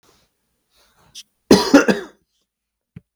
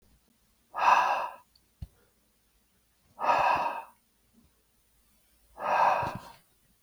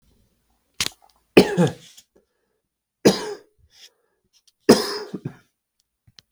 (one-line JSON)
{"cough_length": "3.2 s", "cough_amplitude": 32768, "cough_signal_mean_std_ratio": 0.26, "exhalation_length": "6.8 s", "exhalation_amplitude": 11295, "exhalation_signal_mean_std_ratio": 0.4, "three_cough_length": "6.3 s", "three_cough_amplitude": 32768, "three_cough_signal_mean_std_ratio": 0.25, "survey_phase": "beta (2021-08-13 to 2022-03-07)", "age": "18-44", "gender": "Male", "wearing_mask": "No", "symptom_runny_or_blocked_nose": true, "symptom_sore_throat": true, "symptom_onset": "9 days", "smoker_status": "Never smoked", "respiratory_condition_asthma": false, "respiratory_condition_other": false, "recruitment_source": "REACT", "submission_delay": "2 days", "covid_test_result": "Negative", "covid_test_method": "RT-qPCR"}